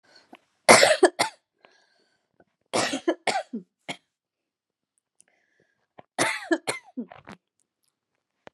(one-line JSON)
{"three_cough_length": "8.5 s", "three_cough_amplitude": 32767, "three_cough_signal_mean_std_ratio": 0.26, "survey_phase": "beta (2021-08-13 to 2022-03-07)", "age": "18-44", "gender": "Female", "wearing_mask": "No", "symptom_new_continuous_cough": true, "symptom_runny_or_blocked_nose": true, "symptom_fatigue": true, "symptom_fever_high_temperature": true, "symptom_headache": true, "symptom_change_to_sense_of_smell_or_taste": true, "symptom_other": true, "symptom_onset": "2 days", "smoker_status": "Never smoked", "respiratory_condition_asthma": false, "respiratory_condition_other": false, "recruitment_source": "Test and Trace", "submission_delay": "1 day", "covid_test_result": "Positive", "covid_test_method": "RT-qPCR", "covid_ct_value": 18.3, "covid_ct_gene": "N gene"}